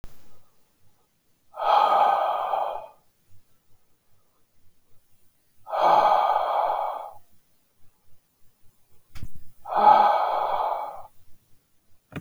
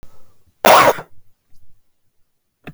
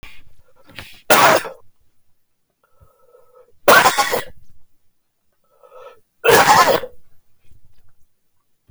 {"exhalation_length": "12.2 s", "exhalation_amplitude": 21857, "exhalation_signal_mean_std_ratio": 0.5, "cough_length": "2.7 s", "cough_amplitude": 32768, "cough_signal_mean_std_ratio": 0.33, "three_cough_length": "8.7 s", "three_cough_amplitude": 32768, "three_cough_signal_mean_std_ratio": 0.36, "survey_phase": "beta (2021-08-13 to 2022-03-07)", "age": "45-64", "gender": "Male", "wearing_mask": "No", "symptom_cough_any": true, "symptom_runny_or_blocked_nose": true, "symptom_shortness_of_breath": true, "symptom_fatigue": true, "symptom_fever_high_temperature": true, "symptom_onset": "4 days", "smoker_status": "Ex-smoker", "respiratory_condition_asthma": false, "respiratory_condition_other": false, "recruitment_source": "Test and Trace", "submission_delay": "2 days", "covid_test_result": "Positive", "covid_test_method": "RT-qPCR", "covid_ct_value": 13.2, "covid_ct_gene": "ORF1ab gene", "covid_ct_mean": 14.0, "covid_viral_load": "26000000 copies/ml", "covid_viral_load_category": "High viral load (>1M copies/ml)"}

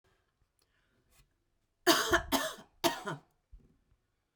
{"three_cough_length": "4.4 s", "three_cough_amplitude": 10524, "three_cough_signal_mean_std_ratio": 0.31, "survey_phase": "beta (2021-08-13 to 2022-03-07)", "age": "45-64", "gender": "Female", "wearing_mask": "No", "symptom_none": true, "smoker_status": "Ex-smoker", "respiratory_condition_asthma": false, "respiratory_condition_other": false, "recruitment_source": "REACT", "submission_delay": "1 day", "covid_test_result": "Negative", "covid_test_method": "RT-qPCR"}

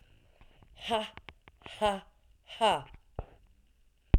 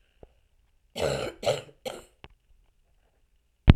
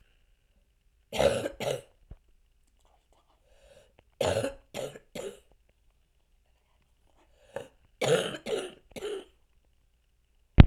{"exhalation_length": "4.2 s", "exhalation_amplitude": 10930, "exhalation_signal_mean_std_ratio": 0.3, "cough_length": "3.8 s", "cough_amplitude": 32767, "cough_signal_mean_std_ratio": 0.22, "three_cough_length": "10.7 s", "three_cough_amplitude": 32767, "three_cough_signal_mean_std_ratio": 0.23, "survey_phase": "alpha (2021-03-01 to 2021-08-12)", "age": "45-64", "gender": "Female", "wearing_mask": "No", "symptom_cough_any": true, "symptom_new_continuous_cough": true, "symptom_shortness_of_breath": true, "symptom_abdominal_pain": true, "symptom_headache": true, "symptom_onset": "4 days", "smoker_status": "Never smoked", "respiratory_condition_asthma": false, "respiratory_condition_other": false, "recruitment_source": "Test and Trace", "submission_delay": "2 days", "covid_test_result": "Positive", "covid_test_method": "RT-qPCR", "covid_ct_value": 15.9, "covid_ct_gene": "ORF1ab gene", "covid_ct_mean": 16.2, "covid_viral_load": "4800000 copies/ml", "covid_viral_load_category": "High viral load (>1M copies/ml)"}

